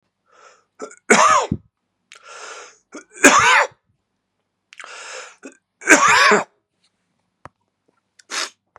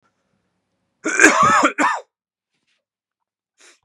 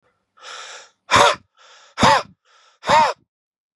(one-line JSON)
{"three_cough_length": "8.8 s", "three_cough_amplitude": 32768, "three_cough_signal_mean_std_ratio": 0.35, "cough_length": "3.8 s", "cough_amplitude": 32768, "cough_signal_mean_std_ratio": 0.36, "exhalation_length": "3.8 s", "exhalation_amplitude": 30790, "exhalation_signal_mean_std_ratio": 0.37, "survey_phase": "beta (2021-08-13 to 2022-03-07)", "age": "45-64", "gender": "Male", "wearing_mask": "No", "symptom_cough_any": true, "symptom_runny_or_blocked_nose": true, "symptom_headache": true, "symptom_change_to_sense_of_smell_or_taste": true, "smoker_status": "Never smoked", "respiratory_condition_asthma": false, "respiratory_condition_other": false, "recruitment_source": "Test and Trace", "submission_delay": "2 days", "covid_test_result": "Positive", "covid_test_method": "RT-qPCR", "covid_ct_value": 26.4, "covid_ct_gene": "ORF1ab gene"}